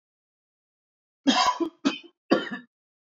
{"cough_length": "3.2 s", "cough_amplitude": 20001, "cough_signal_mean_std_ratio": 0.36, "survey_phase": "beta (2021-08-13 to 2022-03-07)", "age": "18-44", "gender": "Male", "wearing_mask": "No", "symptom_none": true, "smoker_status": "Ex-smoker", "respiratory_condition_asthma": false, "respiratory_condition_other": false, "recruitment_source": "REACT", "submission_delay": "2 days", "covid_test_result": "Negative", "covid_test_method": "RT-qPCR", "influenza_a_test_result": "Negative", "influenza_b_test_result": "Negative"}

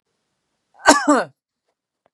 {"cough_length": "2.1 s", "cough_amplitude": 32768, "cough_signal_mean_std_ratio": 0.3, "survey_phase": "beta (2021-08-13 to 2022-03-07)", "age": "45-64", "gender": "Female", "wearing_mask": "No", "symptom_none": true, "smoker_status": "Never smoked", "respiratory_condition_asthma": false, "respiratory_condition_other": true, "recruitment_source": "REACT", "submission_delay": "0 days", "covid_test_result": "Negative", "covid_test_method": "RT-qPCR", "influenza_a_test_result": "Negative", "influenza_b_test_result": "Negative"}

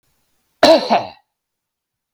{"cough_length": "2.1 s", "cough_amplitude": 32768, "cough_signal_mean_std_ratio": 0.32, "survey_phase": "beta (2021-08-13 to 2022-03-07)", "age": "45-64", "gender": "Male", "wearing_mask": "No", "symptom_none": true, "smoker_status": "Never smoked", "respiratory_condition_asthma": false, "respiratory_condition_other": false, "recruitment_source": "REACT", "submission_delay": "3 days", "covid_test_result": "Negative", "covid_test_method": "RT-qPCR"}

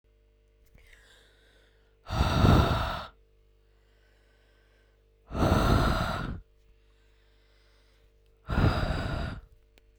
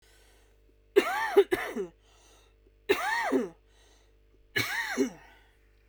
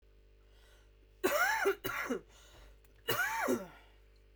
{"exhalation_length": "10.0 s", "exhalation_amplitude": 13654, "exhalation_signal_mean_std_ratio": 0.42, "three_cough_length": "5.9 s", "three_cough_amplitude": 12556, "three_cough_signal_mean_std_ratio": 0.42, "cough_length": "4.4 s", "cough_amplitude": 4194, "cough_signal_mean_std_ratio": 0.52, "survey_phase": "beta (2021-08-13 to 2022-03-07)", "age": "18-44", "gender": "Female", "wearing_mask": "No", "symptom_cough_any": true, "symptom_runny_or_blocked_nose": true, "symptom_headache": true, "symptom_onset": "4 days", "smoker_status": "Ex-smoker", "respiratory_condition_asthma": true, "respiratory_condition_other": false, "recruitment_source": "Test and Trace", "submission_delay": "2 days", "covid_test_result": "Positive", "covid_test_method": "RT-qPCR", "covid_ct_value": 17.5, "covid_ct_gene": "N gene"}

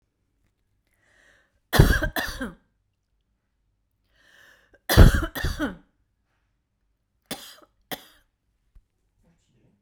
{"three_cough_length": "9.8 s", "three_cough_amplitude": 32768, "three_cough_signal_mean_std_ratio": 0.23, "survey_phase": "beta (2021-08-13 to 2022-03-07)", "age": "45-64", "gender": "Female", "wearing_mask": "No", "symptom_cough_any": true, "smoker_status": "Never smoked", "respiratory_condition_asthma": false, "respiratory_condition_other": true, "recruitment_source": "REACT", "submission_delay": "1 day", "covid_test_result": "Negative", "covid_test_method": "RT-qPCR"}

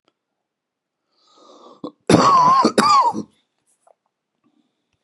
{"cough_length": "5.0 s", "cough_amplitude": 32767, "cough_signal_mean_std_ratio": 0.4, "survey_phase": "beta (2021-08-13 to 2022-03-07)", "age": "65+", "gender": "Male", "wearing_mask": "No", "symptom_new_continuous_cough": true, "symptom_runny_or_blocked_nose": true, "symptom_sore_throat": true, "symptom_fatigue": true, "symptom_onset": "2 days", "smoker_status": "Ex-smoker", "respiratory_condition_asthma": false, "respiratory_condition_other": false, "recruitment_source": "Test and Trace", "submission_delay": "2 days", "covid_test_result": "Positive", "covid_test_method": "RT-qPCR", "covid_ct_value": 22.1, "covid_ct_gene": "ORF1ab gene", "covid_ct_mean": 22.6, "covid_viral_load": "37000 copies/ml", "covid_viral_load_category": "Low viral load (10K-1M copies/ml)"}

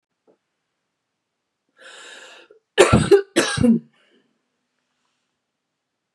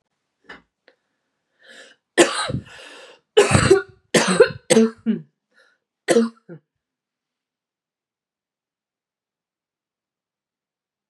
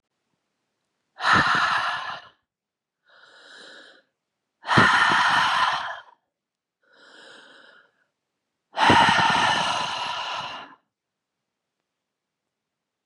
{"cough_length": "6.1 s", "cough_amplitude": 32767, "cough_signal_mean_std_ratio": 0.28, "three_cough_length": "11.1 s", "three_cough_amplitude": 31736, "three_cough_signal_mean_std_ratio": 0.29, "exhalation_length": "13.1 s", "exhalation_amplitude": 21479, "exhalation_signal_mean_std_ratio": 0.44, "survey_phase": "beta (2021-08-13 to 2022-03-07)", "age": "18-44", "gender": "Female", "wearing_mask": "No", "symptom_cough_any": true, "symptom_runny_or_blocked_nose": true, "symptom_fever_high_temperature": true, "symptom_onset": "4 days", "smoker_status": "Never smoked", "respiratory_condition_asthma": false, "respiratory_condition_other": false, "recruitment_source": "REACT", "submission_delay": "1 day", "covid_test_result": "Positive", "covid_test_method": "RT-qPCR", "covid_ct_value": 28.4, "covid_ct_gene": "E gene", "influenza_a_test_result": "Negative", "influenza_b_test_result": "Negative"}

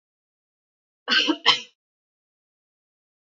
{"cough_length": "3.2 s", "cough_amplitude": 25347, "cough_signal_mean_std_ratio": 0.26, "survey_phase": "beta (2021-08-13 to 2022-03-07)", "age": "18-44", "gender": "Female", "wearing_mask": "No", "symptom_runny_or_blocked_nose": true, "smoker_status": "Never smoked", "respiratory_condition_asthma": false, "respiratory_condition_other": false, "recruitment_source": "Test and Trace", "submission_delay": "2 days", "covid_test_result": "Positive", "covid_test_method": "RT-qPCR", "covid_ct_value": 22.5, "covid_ct_gene": "ORF1ab gene", "covid_ct_mean": 23.0, "covid_viral_load": "29000 copies/ml", "covid_viral_load_category": "Low viral load (10K-1M copies/ml)"}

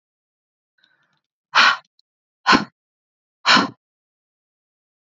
{"exhalation_length": "5.1 s", "exhalation_amplitude": 28635, "exhalation_signal_mean_std_ratio": 0.26, "survey_phase": "alpha (2021-03-01 to 2021-08-12)", "age": "18-44", "gender": "Female", "wearing_mask": "No", "symptom_none": true, "smoker_status": "Never smoked", "respiratory_condition_asthma": true, "respiratory_condition_other": false, "recruitment_source": "REACT", "submission_delay": "1 day", "covid_test_result": "Negative", "covid_test_method": "RT-qPCR"}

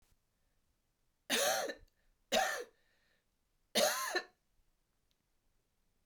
{"three_cough_length": "6.1 s", "three_cough_amplitude": 4163, "three_cough_signal_mean_std_ratio": 0.36, "survey_phase": "beta (2021-08-13 to 2022-03-07)", "age": "45-64", "gender": "Female", "wearing_mask": "No", "symptom_cough_any": true, "symptom_runny_or_blocked_nose": true, "symptom_shortness_of_breath": true, "symptom_sore_throat": true, "symptom_onset": "4 days", "smoker_status": "Never smoked", "respiratory_condition_asthma": false, "respiratory_condition_other": false, "recruitment_source": "Test and Trace", "submission_delay": "1 day", "covid_test_result": "Positive", "covid_test_method": "RT-qPCR", "covid_ct_value": 16.5, "covid_ct_gene": "ORF1ab gene"}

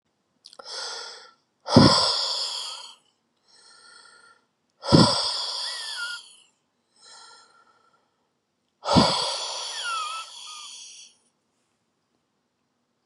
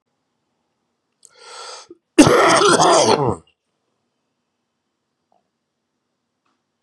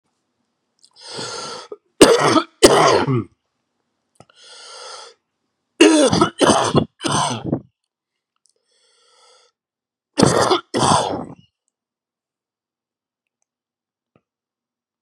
{"exhalation_length": "13.1 s", "exhalation_amplitude": 32240, "exhalation_signal_mean_std_ratio": 0.36, "cough_length": "6.8 s", "cough_amplitude": 32768, "cough_signal_mean_std_ratio": 0.33, "three_cough_length": "15.0 s", "three_cough_amplitude": 32768, "three_cough_signal_mean_std_ratio": 0.36, "survey_phase": "beta (2021-08-13 to 2022-03-07)", "age": "45-64", "gender": "Male", "wearing_mask": "No", "symptom_cough_any": true, "symptom_runny_or_blocked_nose": true, "symptom_fatigue": true, "symptom_fever_high_temperature": true, "symptom_headache": true, "smoker_status": "Ex-smoker", "respiratory_condition_asthma": false, "respiratory_condition_other": false, "recruitment_source": "Test and Trace", "submission_delay": "2 days", "covid_test_result": "Positive", "covid_test_method": "LFT"}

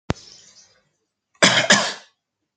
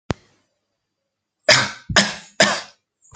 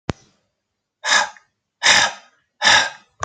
{"cough_length": "2.6 s", "cough_amplitude": 30074, "cough_signal_mean_std_ratio": 0.33, "three_cough_length": "3.2 s", "three_cough_amplitude": 32768, "three_cough_signal_mean_std_ratio": 0.33, "exhalation_length": "3.2 s", "exhalation_amplitude": 30010, "exhalation_signal_mean_std_ratio": 0.4, "survey_phase": "alpha (2021-03-01 to 2021-08-12)", "age": "45-64", "gender": "Male", "wearing_mask": "No", "symptom_none": true, "smoker_status": "Never smoked", "respiratory_condition_asthma": false, "respiratory_condition_other": false, "recruitment_source": "REACT", "submission_delay": "24 days", "covid_test_result": "Negative", "covid_test_method": "RT-qPCR"}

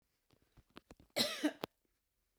{"cough_length": "2.4 s", "cough_amplitude": 3896, "cough_signal_mean_std_ratio": 0.29, "survey_phase": "beta (2021-08-13 to 2022-03-07)", "age": "65+", "gender": "Female", "wearing_mask": "No", "symptom_none": true, "smoker_status": "Ex-smoker", "respiratory_condition_asthma": true, "respiratory_condition_other": false, "recruitment_source": "REACT", "submission_delay": "1 day", "covid_test_result": "Negative", "covid_test_method": "RT-qPCR", "influenza_a_test_result": "Negative", "influenza_b_test_result": "Negative"}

